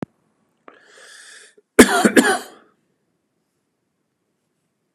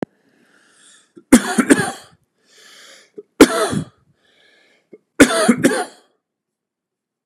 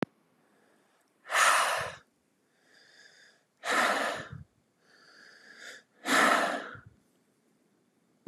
{"cough_length": "4.9 s", "cough_amplitude": 32768, "cough_signal_mean_std_ratio": 0.24, "three_cough_length": "7.3 s", "three_cough_amplitude": 32768, "three_cough_signal_mean_std_ratio": 0.31, "exhalation_length": "8.3 s", "exhalation_amplitude": 10909, "exhalation_signal_mean_std_ratio": 0.39, "survey_phase": "beta (2021-08-13 to 2022-03-07)", "age": "45-64", "gender": "Male", "wearing_mask": "No", "symptom_none": true, "smoker_status": "Ex-smoker", "respiratory_condition_asthma": false, "respiratory_condition_other": false, "recruitment_source": "REACT", "submission_delay": "2 days", "covid_test_result": "Negative", "covid_test_method": "RT-qPCR", "influenza_a_test_result": "Negative", "influenza_b_test_result": "Negative"}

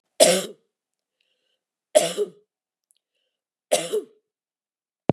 {"three_cough_length": "5.1 s", "three_cough_amplitude": 32509, "three_cough_signal_mean_std_ratio": 0.27, "survey_phase": "beta (2021-08-13 to 2022-03-07)", "age": "45-64", "gender": "Female", "wearing_mask": "No", "symptom_cough_any": true, "symptom_onset": "13 days", "smoker_status": "Never smoked", "respiratory_condition_asthma": false, "respiratory_condition_other": false, "recruitment_source": "REACT", "submission_delay": "0 days", "covid_test_result": "Negative", "covid_test_method": "RT-qPCR", "influenza_a_test_result": "Negative", "influenza_b_test_result": "Negative"}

